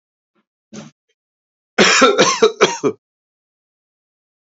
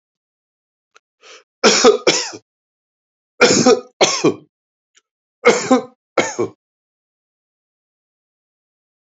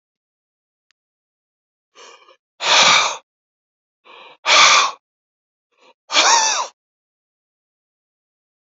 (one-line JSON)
{"cough_length": "4.5 s", "cough_amplitude": 30346, "cough_signal_mean_std_ratio": 0.36, "three_cough_length": "9.1 s", "three_cough_amplitude": 32767, "three_cough_signal_mean_std_ratio": 0.33, "exhalation_length": "8.8 s", "exhalation_amplitude": 32767, "exhalation_signal_mean_std_ratio": 0.33, "survey_phase": "beta (2021-08-13 to 2022-03-07)", "age": "45-64", "gender": "Male", "wearing_mask": "No", "symptom_none": true, "smoker_status": "Never smoked", "respiratory_condition_asthma": false, "respiratory_condition_other": false, "recruitment_source": "REACT", "submission_delay": "0 days", "covid_test_result": "Negative", "covid_test_method": "RT-qPCR", "influenza_a_test_result": "Unknown/Void", "influenza_b_test_result": "Unknown/Void"}